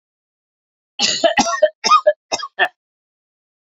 {"three_cough_length": "3.7 s", "three_cough_amplitude": 28551, "three_cough_signal_mean_std_ratio": 0.39, "survey_phase": "beta (2021-08-13 to 2022-03-07)", "age": "45-64", "gender": "Female", "wearing_mask": "No", "symptom_runny_or_blocked_nose": true, "symptom_shortness_of_breath": true, "symptom_fatigue": true, "symptom_headache": true, "symptom_change_to_sense_of_smell_or_taste": true, "smoker_status": "Never smoked", "respiratory_condition_asthma": false, "respiratory_condition_other": false, "recruitment_source": "Test and Trace", "submission_delay": "3 days", "covid_test_result": "Positive", "covid_test_method": "RT-qPCR", "covid_ct_value": 15.5, "covid_ct_gene": "ORF1ab gene", "covid_ct_mean": 15.9, "covid_viral_load": "6300000 copies/ml", "covid_viral_load_category": "High viral load (>1M copies/ml)"}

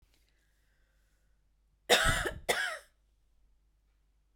{"cough_length": "4.4 s", "cough_amplitude": 10897, "cough_signal_mean_std_ratio": 0.31, "survey_phase": "beta (2021-08-13 to 2022-03-07)", "age": "45-64", "gender": "Female", "wearing_mask": "No", "symptom_none": true, "smoker_status": "Ex-smoker", "respiratory_condition_asthma": false, "respiratory_condition_other": false, "recruitment_source": "REACT", "submission_delay": "2 days", "covid_test_result": "Negative", "covid_test_method": "RT-qPCR"}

